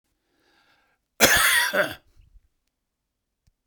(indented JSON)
{
  "cough_length": "3.7 s",
  "cough_amplitude": 32768,
  "cough_signal_mean_std_ratio": 0.34,
  "survey_phase": "beta (2021-08-13 to 2022-03-07)",
  "age": "45-64",
  "gender": "Male",
  "wearing_mask": "No",
  "symptom_none": true,
  "smoker_status": "Never smoked",
  "respiratory_condition_asthma": false,
  "respiratory_condition_other": true,
  "recruitment_source": "REACT",
  "submission_delay": "2 days",
  "covid_test_result": "Negative",
  "covid_test_method": "RT-qPCR"
}